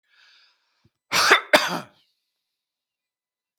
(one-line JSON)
{"cough_length": "3.6 s", "cough_amplitude": 32768, "cough_signal_mean_std_ratio": 0.27, "survey_phase": "beta (2021-08-13 to 2022-03-07)", "age": "45-64", "gender": "Male", "wearing_mask": "No", "symptom_none": true, "smoker_status": "Never smoked", "respiratory_condition_asthma": false, "respiratory_condition_other": false, "recruitment_source": "REACT", "submission_delay": "1 day", "covid_test_result": "Negative", "covid_test_method": "RT-qPCR", "influenza_a_test_result": "Negative", "influenza_b_test_result": "Negative"}